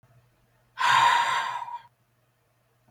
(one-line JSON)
{"exhalation_length": "2.9 s", "exhalation_amplitude": 12350, "exhalation_signal_mean_std_ratio": 0.45, "survey_phase": "beta (2021-08-13 to 2022-03-07)", "age": "18-44", "gender": "Male", "wearing_mask": "No", "symptom_runny_or_blocked_nose": true, "symptom_sore_throat": true, "smoker_status": "Ex-smoker", "respiratory_condition_asthma": false, "respiratory_condition_other": false, "recruitment_source": "Test and Trace", "submission_delay": "2 days", "covid_test_result": "Positive", "covid_test_method": "ePCR"}